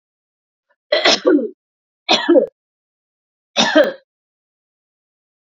{"three_cough_length": "5.5 s", "three_cough_amplitude": 30927, "three_cough_signal_mean_std_ratio": 0.36, "survey_phase": "beta (2021-08-13 to 2022-03-07)", "age": "18-44", "gender": "Female", "wearing_mask": "No", "symptom_none": true, "smoker_status": "Ex-smoker", "respiratory_condition_asthma": false, "respiratory_condition_other": false, "recruitment_source": "REACT", "submission_delay": "0 days", "covid_test_result": "Negative", "covid_test_method": "RT-qPCR"}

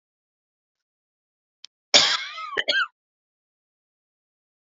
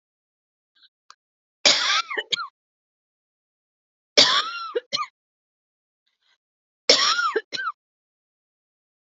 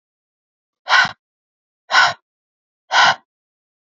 {"cough_length": "4.8 s", "cough_amplitude": 31960, "cough_signal_mean_std_ratio": 0.25, "three_cough_length": "9.0 s", "three_cough_amplitude": 32589, "three_cough_signal_mean_std_ratio": 0.32, "exhalation_length": "3.8 s", "exhalation_amplitude": 28804, "exhalation_signal_mean_std_ratio": 0.32, "survey_phase": "alpha (2021-03-01 to 2021-08-12)", "age": "18-44", "gender": "Female", "wearing_mask": "No", "symptom_none": true, "smoker_status": "Ex-smoker", "respiratory_condition_asthma": false, "respiratory_condition_other": false, "recruitment_source": "REACT", "submission_delay": "1 day", "covid_test_result": "Negative", "covid_test_method": "RT-qPCR"}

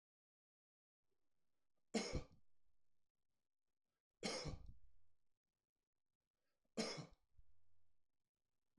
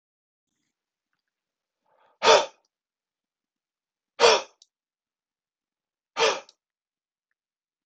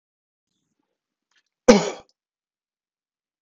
{"three_cough_length": "8.8 s", "three_cough_amplitude": 1285, "three_cough_signal_mean_std_ratio": 0.34, "exhalation_length": "7.9 s", "exhalation_amplitude": 21142, "exhalation_signal_mean_std_ratio": 0.21, "cough_length": "3.4 s", "cough_amplitude": 25796, "cough_signal_mean_std_ratio": 0.16, "survey_phase": "alpha (2021-03-01 to 2021-08-12)", "age": "18-44", "gender": "Male", "wearing_mask": "No", "symptom_none": true, "symptom_onset": "12 days", "smoker_status": "Never smoked", "respiratory_condition_asthma": false, "respiratory_condition_other": false, "recruitment_source": "REACT", "submission_delay": "2 days", "covid_test_result": "Negative", "covid_test_method": "RT-qPCR"}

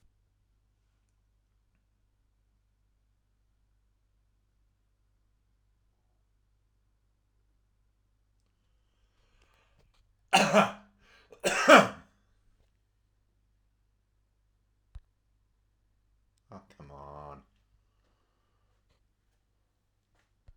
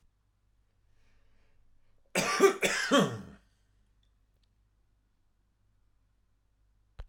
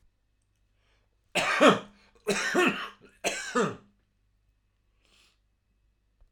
{"exhalation_length": "20.6 s", "exhalation_amplitude": 20768, "exhalation_signal_mean_std_ratio": 0.15, "cough_length": "7.1 s", "cough_amplitude": 9993, "cough_signal_mean_std_ratio": 0.28, "three_cough_length": "6.3 s", "three_cough_amplitude": 15838, "three_cough_signal_mean_std_ratio": 0.34, "survey_phase": "alpha (2021-03-01 to 2021-08-12)", "age": "65+", "gender": "Male", "wearing_mask": "No", "symptom_none": true, "smoker_status": "Current smoker (11 or more cigarettes per day)", "respiratory_condition_asthma": false, "respiratory_condition_other": false, "recruitment_source": "REACT", "submission_delay": "3 days", "covid_test_result": "Negative", "covid_test_method": "RT-qPCR"}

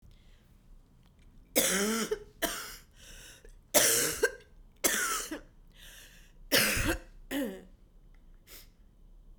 {"three_cough_length": "9.4 s", "three_cough_amplitude": 12373, "three_cough_signal_mean_std_ratio": 0.46, "survey_phase": "beta (2021-08-13 to 2022-03-07)", "age": "65+", "gender": "Female", "wearing_mask": "No", "symptom_new_continuous_cough": true, "symptom_runny_or_blocked_nose": true, "symptom_shortness_of_breath": true, "symptom_fatigue": true, "symptom_headache": true, "symptom_other": true, "symptom_onset": "3 days", "smoker_status": "Never smoked", "respiratory_condition_asthma": true, "respiratory_condition_other": false, "recruitment_source": "Test and Trace", "submission_delay": "2 days", "covid_test_result": "Positive", "covid_test_method": "ePCR"}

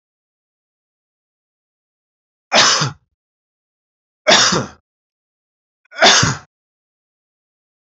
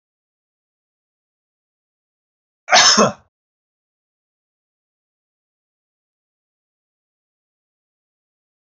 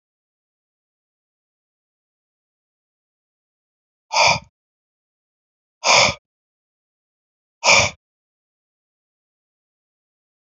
{"three_cough_length": "7.9 s", "three_cough_amplitude": 32767, "three_cough_signal_mean_std_ratio": 0.29, "cough_length": "8.8 s", "cough_amplitude": 32768, "cough_signal_mean_std_ratio": 0.17, "exhalation_length": "10.4 s", "exhalation_amplitude": 30462, "exhalation_signal_mean_std_ratio": 0.21, "survey_phase": "alpha (2021-03-01 to 2021-08-12)", "age": "45-64", "gender": "Male", "wearing_mask": "No", "symptom_none": true, "smoker_status": "Never smoked", "respiratory_condition_asthma": false, "respiratory_condition_other": false, "recruitment_source": "REACT", "submission_delay": "1 day", "covid_test_result": "Negative", "covid_test_method": "RT-qPCR"}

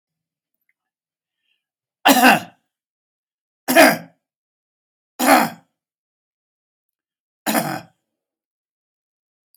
{"three_cough_length": "9.6 s", "three_cough_amplitude": 32767, "three_cough_signal_mean_std_ratio": 0.26, "survey_phase": "beta (2021-08-13 to 2022-03-07)", "age": "65+", "gender": "Male", "wearing_mask": "No", "symptom_none": true, "smoker_status": "Ex-smoker", "respiratory_condition_asthma": false, "respiratory_condition_other": false, "recruitment_source": "REACT", "submission_delay": "1 day", "covid_test_result": "Negative", "covid_test_method": "RT-qPCR"}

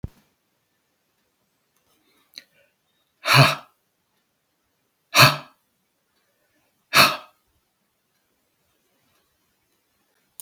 {"exhalation_length": "10.4 s", "exhalation_amplitude": 32768, "exhalation_signal_mean_std_ratio": 0.2, "survey_phase": "beta (2021-08-13 to 2022-03-07)", "age": "65+", "gender": "Male", "wearing_mask": "No", "symptom_none": true, "smoker_status": "Never smoked", "respiratory_condition_asthma": false, "respiratory_condition_other": false, "recruitment_source": "REACT", "submission_delay": "5 days", "covid_test_result": "Negative", "covid_test_method": "RT-qPCR", "influenza_a_test_result": "Negative", "influenza_b_test_result": "Negative"}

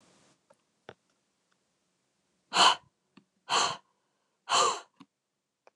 {"exhalation_length": "5.8 s", "exhalation_amplitude": 11793, "exhalation_signal_mean_std_ratio": 0.27, "survey_phase": "beta (2021-08-13 to 2022-03-07)", "age": "45-64", "gender": "Female", "wearing_mask": "No", "symptom_none": true, "smoker_status": "Never smoked", "respiratory_condition_asthma": false, "respiratory_condition_other": false, "recruitment_source": "Test and Trace", "submission_delay": "0 days", "covid_test_result": "Negative", "covid_test_method": "LFT"}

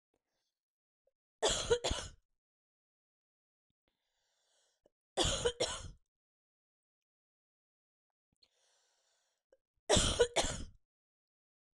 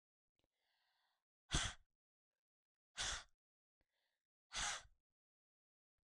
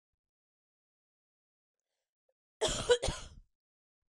{"three_cough_length": "11.8 s", "three_cough_amplitude": 6480, "three_cough_signal_mean_std_ratio": 0.28, "exhalation_length": "6.0 s", "exhalation_amplitude": 2367, "exhalation_signal_mean_std_ratio": 0.26, "cough_length": "4.1 s", "cough_amplitude": 7756, "cough_signal_mean_std_ratio": 0.24, "survey_phase": "beta (2021-08-13 to 2022-03-07)", "age": "45-64", "gender": "Female", "wearing_mask": "No", "symptom_fatigue": true, "symptom_onset": "12 days", "smoker_status": "Never smoked", "respiratory_condition_asthma": false, "respiratory_condition_other": false, "recruitment_source": "REACT", "submission_delay": "1 day", "covid_test_result": "Negative", "covid_test_method": "RT-qPCR", "influenza_a_test_result": "Negative", "influenza_b_test_result": "Negative"}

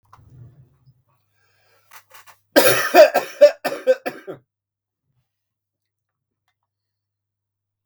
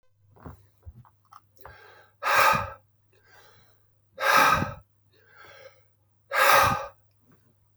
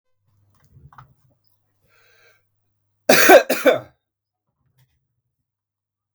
{"three_cough_length": "7.9 s", "three_cough_amplitude": 32768, "three_cough_signal_mean_std_ratio": 0.25, "exhalation_length": "7.8 s", "exhalation_amplitude": 21341, "exhalation_signal_mean_std_ratio": 0.36, "cough_length": "6.1 s", "cough_amplitude": 32768, "cough_signal_mean_std_ratio": 0.23, "survey_phase": "beta (2021-08-13 to 2022-03-07)", "age": "45-64", "gender": "Male", "wearing_mask": "No", "symptom_cough_any": true, "symptom_fatigue": true, "symptom_fever_high_temperature": true, "symptom_onset": "3 days", "smoker_status": "Ex-smoker", "respiratory_condition_asthma": false, "respiratory_condition_other": false, "recruitment_source": "Test and Trace", "submission_delay": "2 days", "covid_test_result": "Positive", "covid_test_method": "ePCR"}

